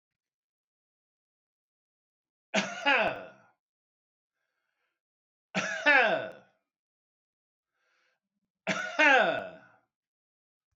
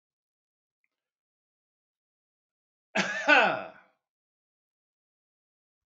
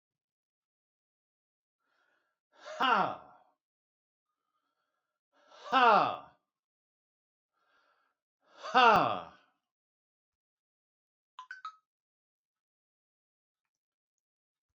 {"three_cough_length": "10.8 s", "three_cough_amplitude": 13068, "three_cough_signal_mean_std_ratio": 0.3, "cough_length": "5.9 s", "cough_amplitude": 17996, "cough_signal_mean_std_ratio": 0.23, "exhalation_length": "14.8 s", "exhalation_amplitude": 10190, "exhalation_signal_mean_std_ratio": 0.22, "survey_phase": "alpha (2021-03-01 to 2021-08-12)", "age": "65+", "gender": "Male", "wearing_mask": "No", "symptom_none": true, "smoker_status": "Never smoked", "respiratory_condition_asthma": false, "respiratory_condition_other": false, "recruitment_source": "REACT", "submission_delay": "3 days", "covid_test_result": "Negative", "covid_test_method": "RT-qPCR"}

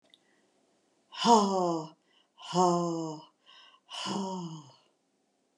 {"exhalation_length": "5.6 s", "exhalation_amplitude": 13419, "exhalation_signal_mean_std_ratio": 0.41, "survey_phase": "alpha (2021-03-01 to 2021-08-12)", "age": "45-64", "gender": "Female", "wearing_mask": "No", "symptom_none": true, "smoker_status": "Never smoked", "respiratory_condition_asthma": false, "respiratory_condition_other": false, "recruitment_source": "REACT", "submission_delay": "5 days", "covid_test_result": "Negative", "covid_test_method": "RT-qPCR"}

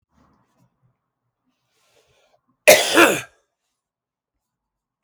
{"cough_length": "5.0 s", "cough_amplitude": 32768, "cough_signal_mean_std_ratio": 0.22, "survey_phase": "beta (2021-08-13 to 2022-03-07)", "age": "45-64", "gender": "Male", "wearing_mask": "No", "symptom_none": true, "smoker_status": "Ex-smoker", "respiratory_condition_asthma": false, "respiratory_condition_other": false, "recruitment_source": "REACT", "submission_delay": "1 day", "covid_test_result": "Negative", "covid_test_method": "RT-qPCR"}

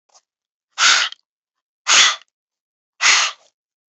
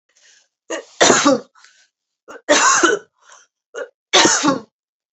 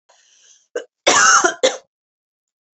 {"exhalation_length": "3.9 s", "exhalation_amplitude": 32768, "exhalation_signal_mean_std_ratio": 0.37, "three_cough_length": "5.1 s", "three_cough_amplitude": 32768, "three_cough_signal_mean_std_ratio": 0.44, "cough_length": "2.7 s", "cough_amplitude": 32767, "cough_signal_mean_std_ratio": 0.38, "survey_phase": "beta (2021-08-13 to 2022-03-07)", "age": "45-64", "gender": "Female", "wearing_mask": "No", "symptom_none": true, "smoker_status": "Never smoked", "respiratory_condition_asthma": false, "respiratory_condition_other": false, "recruitment_source": "REACT", "submission_delay": "2 days", "covid_test_result": "Negative", "covid_test_method": "RT-qPCR", "influenza_a_test_result": "Unknown/Void", "influenza_b_test_result": "Unknown/Void"}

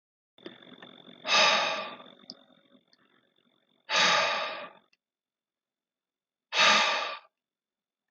{"exhalation_length": "8.1 s", "exhalation_amplitude": 11670, "exhalation_signal_mean_std_ratio": 0.39, "survey_phase": "beta (2021-08-13 to 2022-03-07)", "age": "45-64", "gender": "Male", "wearing_mask": "No", "symptom_other": true, "smoker_status": "Never smoked", "respiratory_condition_asthma": false, "respiratory_condition_other": false, "recruitment_source": "Test and Trace", "submission_delay": "1 day", "covid_test_result": "Positive", "covid_test_method": "RT-qPCR", "covid_ct_value": 25.4, "covid_ct_gene": "N gene", "covid_ct_mean": 26.0, "covid_viral_load": "2900 copies/ml", "covid_viral_load_category": "Minimal viral load (< 10K copies/ml)"}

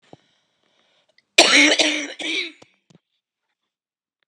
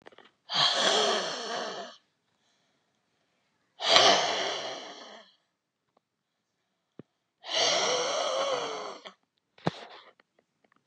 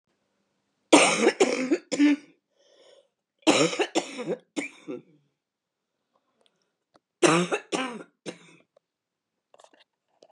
{"cough_length": "4.3 s", "cough_amplitude": 32768, "cough_signal_mean_std_ratio": 0.33, "exhalation_length": "10.9 s", "exhalation_amplitude": 29736, "exhalation_signal_mean_std_ratio": 0.45, "three_cough_length": "10.3 s", "three_cough_amplitude": 28125, "three_cough_signal_mean_std_ratio": 0.35, "survey_phase": "beta (2021-08-13 to 2022-03-07)", "age": "65+", "gender": "Female", "wearing_mask": "No", "symptom_cough_any": true, "symptom_runny_or_blocked_nose": true, "symptom_shortness_of_breath": true, "symptom_fatigue": true, "symptom_headache": true, "smoker_status": "Ex-smoker", "respiratory_condition_asthma": true, "respiratory_condition_other": false, "recruitment_source": "REACT", "submission_delay": "2 days", "covid_test_result": "Negative", "covid_test_method": "RT-qPCR", "covid_ct_value": 37.0, "covid_ct_gene": "N gene", "influenza_a_test_result": "Negative", "influenza_b_test_result": "Negative"}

